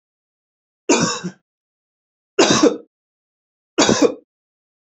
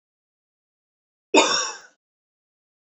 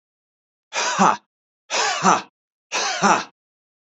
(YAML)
three_cough_length: 4.9 s
three_cough_amplitude: 32767
three_cough_signal_mean_std_ratio: 0.35
cough_length: 2.9 s
cough_amplitude: 27917
cough_signal_mean_std_ratio: 0.26
exhalation_length: 3.8 s
exhalation_amplitude: 28772
exhalation_signal_mean_std_ratio: 0.45
survey_phase: beta (2021-08-13 to 2022-03-07)
age: 45-64
gender: Male
wearing_mask: 'No'
symptom_none: true
smoker_status: Never smoked
respiratory_condition_asthma: false
respiratory_condition_other: false
recruitment_source: REACT
submission_delay: 2 days
covid_test_result: Negative
covid_test_method: RT-qPCR
influenza_a_test_result: Negative
influenza_b_test_result: Negative